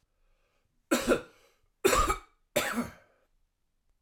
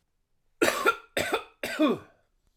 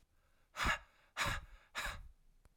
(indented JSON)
{
  "three_cough_length": "4.0 s",
  "three_cough_amplitude": 9583,
  "three_cough_signal_mean_std_ratio": 0.37,
  "cough_length": "2.6 s",
  "cough_amplitude": 12010,
  "cough_signal_mean_std_ratio": 0.45,
  "exhalation_length": "2.6 s",
  "exhalation_amplitude": 2388,
  "exhalation_signal_mean_std_ratio": 0.46,
  "survey_phase": "alpha (2021-03-01 to 2021-08-12)",
  "age": "45-64",
  "gender": "Male",
  "wearing_mask": "No",
  "symptom_cough_any": true,
  "symptom_fatigue": true,
  "symptom_fever_high_temperature": true,
  "symptom_headache": true,
  "symptom_change_to_sense_of_smell_or_taste": true,
  "smoker_status": "Current smoker (e-cigarettes or vapes only)",
  "respiratory_condition_asthma": false,
  "respiratory_condition_other": false,
  "recruitment_source": "Test and Trace",
  "submission_delay": "2 days",
  "covid_test_result": "Positive",
  "covid_test_method": "RT-qPCR",
  "covid_ct_value": 16.0,
  "covid_ct_gene": "ORF1ab gene",
  "covid_ct_mean": 16.4,
  "covid_viral_load": "4200000 copies/ml",
  "covid_viral_load_category": "High viral load (>1M copies/ml)"
}